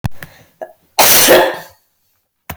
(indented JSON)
{
  "cough_length": "2.6 s",
  "cough_amplitude": 32768,
  "cough_signal_mean_std_ratio": 0.45,
  "survey_phase": "beta (2021-08-13 to 2022-03-07)",
  "age": "45-64",
  "gender": "Female",
  "wearing_mask": "No",
  "symptom_none": true,
  "smoker_status": "Ex-smoker",
  "respiratory_condition_asthma": false,
  "respiratory_condition_other": false,
  "recruitment_source": "REACT",
  "submission_delay": "9 days",
  "covid_test_result": "Negative",
  "covid_test_method": "RT-qPCR"
}